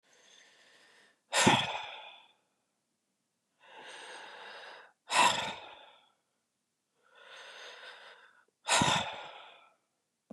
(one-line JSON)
{"exhalation_length": "10.3 s", "exhalation_amplitude": 9825, "exhalation_signal_mean_std_ratio": 0.33, "survey_phase": "beta (2021-08-13 to 2022-03-07)", "age": "65+", "gender": "Male", "wearing_mask": "No", "symptom_headache": true, "smoker_status": "Ex-smoker", "respiratory_condition_asthma": false, "respiratory_condition_other": false, "recruitment_source": "REACT", "submission_delay": "2 days", "covid_test_result": "Negative", "covid_test_method": "RT-qPCR"}